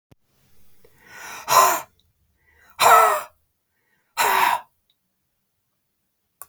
{"exhalation_length": "6.5 s", "exhalation_amplitude": 26537, "exhalation_signal_mean_std_ratio": 0.34, "survey_phase": "beta (2021-08-13 to 2022-03-07)", "age": "45-64", "gender": "Female", "wearing_mask": "No", "symptom_none": true, "smoker_status": "Never smoked", "respiratory_condition_asthma": false, "respiratory_condition_other": false, "recruitment_source": "REACT", "submission_delay": "1 day", "covid_test_result": "Negative", "covid_test_method": "RT-qPCR", "influenza_a_test_result": "Negative", "influenza_b_test_result": "Negative"}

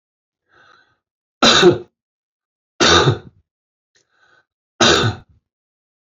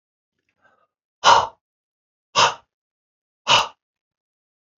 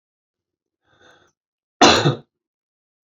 {"three_cough_length": "6.1 s", "three_cough_amplitude": 30612, "three_cough_signal_mean_std_ratio": 0.33, "exhalation_length": "4.8 s", "exhalation_amplitude": 30224, "exhalation_signal_mean_std_ratio": 0.26, "cough_length": "3.1 s", "cough_amplitude": 30461, "cough_signal_mean_std_ratio": 0.25, "survey_phase": "beta (2021-08-13 to 2022-03-07)", "age": "65+", "gender": "Male", "wearing_mask": "No", "symptom_cough_any": true, "symptom_runny_or_blocked_nose": true, "symptom_fatigue": true, "smoker_status": "Never smoked", "respiratory_condition_asthma": false, "respiratory_condition_other": false, "recruitment_source": "Test and Trace", "submission_delay": "1 day", "covid_test_result": "Positive", "covid_test_method": "RT-qPCR"}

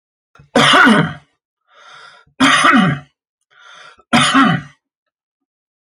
{"three_cough_length": "5.8 s", "three_cough_amplitude": 30817, "three_cough_signal_mean_std_ratio": 0.46, "survey_phase": "alpha (2021-03-01 to 2021-08-12)", "age": "45-64", "gender": "Male", "wearing_mask": "No", "symptom_none": true, "smoker_status": "Never smoked", "respiratory_condition_asthma": false, "respiratory_condition_other": false, "recruitment_source": "REACT", "submission_delay": "1 day", "covid_test_result": "Negative", "covid_test_method": "RT-qPCR"}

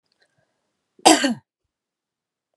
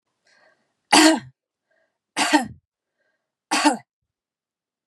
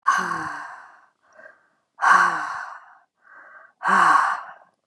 {"cough_length": "2.6 s", "cough_amplitude": 32768, "cough_signal_mean_std_ratio": 0.23, "three_cough_length": "4.9 s", "three_cough_amplitude": 30192, "three_cough_signal_mean_std_ratio": 0.3, "exhalation_length": "4.9 s", "exhalation_amplitude": 25489, "exhalation_signal_mean_std_ratio": 0.47, "survey_phase": "beta (2021-08-13 to 2022-03-07)", "age": "45-64", "gender": "Female", "wearing_mask": "No", "symptom_none": true, "smoker_status": "Never smoked", "respiratory_condition_asthma": false, "respiratory_condition_other": false, "recruitment_source": "REACT", "submission_delay": "1 day", "covid_test_result": "Negative", "covid_test_method": "RT-qPCR", "influenza_a_test_result": "Negative", "influenza_b_test_result": "Negative"}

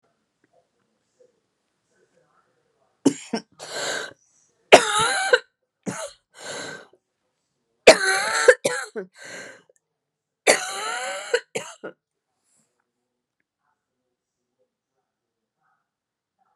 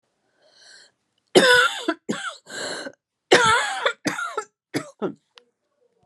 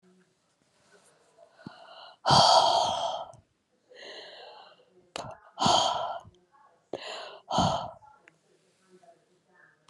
{"three_cough_length": "16.6 s", "three_cough_amplitude": 32768, "three_cough_signal_mean_std_ratio": 0.25, "cough_length": "6.1 s", "cough_amplitude": 31414, "cough_signal_mean_std_ratio": 0.4, "exhalation_length": "9.9 s", "exhalation_amplitude": 13479, "exhalation_signal_mean_std_ratio": 0.37, "survey_phase": "beta (2021-08-13 to 2022-03-07)", "age": "45-64", "gender": "Female", "wearing_mask": "No", "symptom_new_continuous_cough": true, "symptom_runny_or_blocked_nose": true, "symptom_sore_throat": true, "symptom_fatigue": true, "symptom_fever_high_temperature": true, "symptom_headache": true, "symptom_change_to_sense_of_smell_or_taste": true, "symptom_onset": "2 days", "smoker_status": "Never smoked", "respiratory_condition_asthma": false, "respiratory_condition_other": false, "recruitment_source": "Test and Trace", "submission_delay": "2 days", "covid_test_result": "Positive", "covid_test_method": "ePCR"}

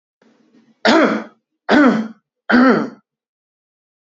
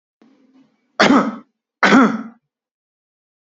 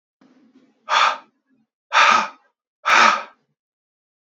{"three_cough_length": "4.1 s", "three_cough_amplitude": 28625, "three_cough_signal_mean_std_ratio": 0.43, "cough_length": "3.5 s", "cough_amplitude": 29253, "cough_signal_mean_std_ratio": 0.36, "exhalation_length": "4.4 s", "exhalation_amplitude": 28320, "exhalation_signal_mean_std_ratio": 0.37, "survey_phase": "beta (2021-08-13 to 2022-03-07)", "age": "18-44", "gender": "Male", "wearing_mask": "No", "symptom_none": true, "smoker_status": "Never smoked", "respiratory_condition_asthma": false, "respiratory_condition_other": false, "recruitment_source": "REACT", "submission_delay": "0 days", "covid_test_result": "Negative", "covid_test_method": "RT-qPCR", "influenza_a_test_result": "Negative", "influenza_b_test_result": "Negative"}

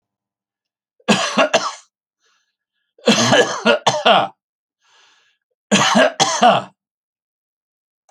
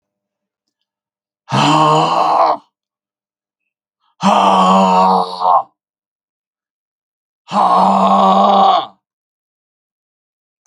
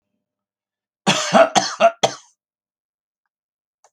{"three_cough_length": "8.1 s", "three_cough_amplitude": 32767, "three_cough_signal_mean_std_ratio": 0.43, "exhalation_length": "10.7 s", "exhalation_amplitude": 30554, "exhalation_signal_mean_std_ratio": 0.53, "cough_length": "3.9 s", "cough_amplitude": 30524, "cough_signal_mean_std_ratio": 0.31, "survey_phase": "alpha (2021-03-01 to 2021-08-12)", "age": "65+", "gender": "Male", "wearing_mask": "No", "symptom_none": true, "smoker_status": "Never smoked", "respiratory_condition_asthma": false, "respiratory_condition_other": false, "recruitment_source": "REACT", "submission_delay": "3 days", "covid_test_result": "Negative", "covid_test_method": "RT-qPCR"}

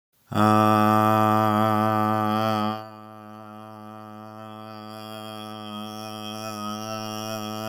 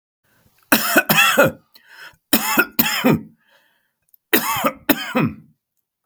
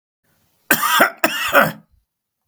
{"exhalation_length": "7.7 s", "exhalation_amplitude": 19225, "exhalation_signal_mean_std_ratio": 0.57, "three_cough_length": "6.1 s", "three_cough_amplitude": 32768, "three_cough_signal_mean_std_ratio": 0.46, "cough_length": "2.5 s", "cough_amplitude": 32768, "cough_signal_mean_std_ratio": 0.44, "survey_phase": "beta (2021-08-13 to 2022-03-07)", "age": "45-64", "gender": "Male", "wearing_mask": "No", "symptom_none": true, "smoker_status": "Never smoked", "respiratory_condition_asthma": false, "respiratory_condition_other": false, "recruitment_source": "REACT", "submission_delay": "0 days", "covid_test_result": "Negative", "covid_test_method": "RT-qPCR", "influenza_a_test_result": "Negative", "influenza_b_test_result": "Negative"}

